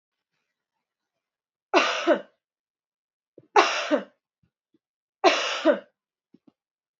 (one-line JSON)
{"three_cough_length": "7.0 s", "three_cough_amplitude": 24890, "three_cough_signal_mean_std_ratio": 0.31, "survey_phase": "beta (2021-08-13 to 2022-03-07)", "age": "18-44", "gender": "Female", "wearing_mask": "No", "symptom_none": true, "smoker_status": "Ex-smoker", "respiratory_condition_asthma": false, "respiratory_condition_other": false, "recruitment_source": "REACT", "submission_delay": "4 days", "covid_test_result": "Negative", "covid_test_method": "RT-qPCR", "influenza_a_test_result": "Negative", "influenza_b_test_result": "Negative"}